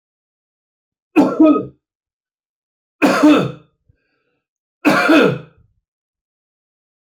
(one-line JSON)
{"three_cough_length": "7.2 s", "three_cough_amplitude": 27575, "three_cough_signal_mean_std_ratio": 0.37, "survey_phase": "alpha (2021-03-01 to 2021-08-12)", "age": "45-64", "gender": "Male", "wearing_mask": "No", "symptom_none": true, "smoker_status": "Never smoked", "respiratory_condition_asthma": false, "respiratory_condition_other": false, "recruitment_source": "REACT", "submission_delay": "2 days", "covid_test_result": "Negative", "covid_test_method": "RT-qPCR"}